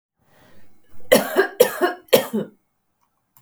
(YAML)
three_cough_length: 3.4 s
three_cough_amplitude: 32768
three_cough_signal_mean_std_ratio: 0.38
survey_phase: beta (2021-08-13 to 2022-03-07)
age: 45-64
gender: Female
wearing_mask: 'No'
symptom_none: true
smoker_status: Never smoked
respiratory_condition_asthma: false
respiratory_condition_other: false
recruitment_source: REACT
submission_delay: 3 days
covid_test_result: Negative
covid_test_method: RT-qPCR